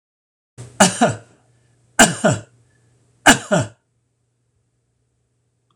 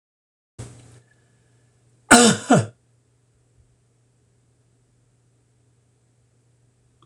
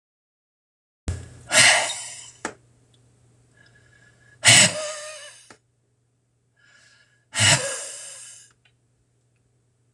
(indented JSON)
{
  "three_cough_length": "5.8 s",
  "three_cough_amplitude": 26028,
  "three_cough_signal_mean_std_ratio": 0.29,
  "cough_length": "7.1 s",
  "cough_amplitude": 26028,
  "cough_signal_mean_std_ratio": 0.2,
  "exhalation_length": "9.9 s",
  "exhalation_amplitude": 26028,
  "exhalation_signal_mean_std_ratio": 0.3,
  "survey_phase": "beta (2021-08-13 to 2022-03-07)",
  "age": "65+",
  "gender": "Male",
  "wearing_mask": "No",
  "symptom_none": true,
  "smoker_status": "Never smoked",
  "respiratory_condition_asthma": false,
  "respiratory_condition_other": false,
  "recruitment_source": "REACT",
  "submission_delay": "3 days",
  "covid_test_result": "Negative",
  "covid_test_method": "RT-qPCR",
  "influenza_a_test_result": "Negative",
  "influenza_b_test_result": "Negative"
}